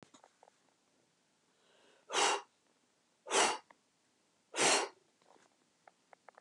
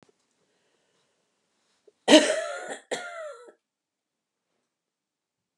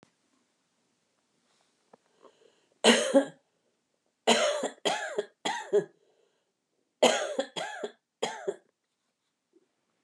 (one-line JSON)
{"exhalation_length": "6.4 s", "exhalation_amplitude": 5644, "exhalation_signal_mean_std_ratio": 0.3, "cough_length": "5.6 s", "cough_amplitude": 31131, "cough_signal_mean_std_ratio": 0.22, "three_cough_length": "10.0 s", "three_cough_amplitude": 17071, "three_cough_signal_mean_std_ratio": 0.33, "survey_phase": "beta (2021-08-13 to 2022-03-07)", "age": "45-64", "gender": "Female", "wearing_mask": "No", "symptom_none": true, "smoker_status": "Never smoked", "respiratory_condition_asthma": false, "respiratory_condition_other": false, "recruitment_source": "REACT", "submission_delay": "2 days", "covid_test_result": "Negative", "covid_test_method": "RT-qPCR", "influenza_a_test_result": "Negative", "influenza_b_test_result": "Negative"}